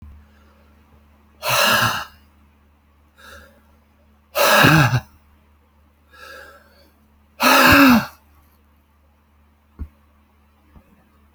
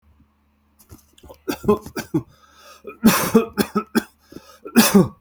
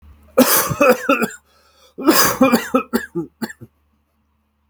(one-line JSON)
{"exhalation_length": "11.3 s", "exhalation_amplitude": 31080, "exhalation_signal_mean_std_ratio": 0.34, "three_cough_length": "5.2 s", "three_cough_amplitude": 31419, "three_cough_signal_mean_std_ratio": 0.38, "cough_length": "4.7 s", "cough_amplitude": 32768, "cough_signal_mean_std_ratio": 0.48, "survey_phase": "beta (2021-08-13 to 2022-03-07)", "age": "45-64", "gender": "Male", "wearing_mask": "No", "symptom_none": true, "smoker_status": "Never smoked", "respiratory_condition_asthma": false, "respiratory_condition_other": false, "recruitment_source": "REACT", "submission_delay": "1 day", "covid_test_result": "Negative", "covid_test_method": "RT-qPCR"}